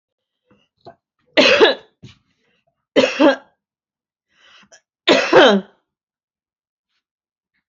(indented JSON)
{
  "three_cough_length": "7.7 s",
  "three_cough_amplitude": 32767,
  "three_cough_signal_mean_std_ratio": 0.32,
  "survey_phase": "alpha (2021-03-01 to 2021-08-12)",
  "age": "65+",
  "gender": "Female",
  "wearing_mask": "No",
  "symptom_none": true,
  "smoker_status": "Never smoked",
  "respiratory_condition_asthma": false,
  "respiratory_condition_other": false,
  "recruitment_source": "REACT",
  "submission_delay": "2 days",
  "covid_test_result": "Negative",
  "covid_test_method": "RT-qPCR"
}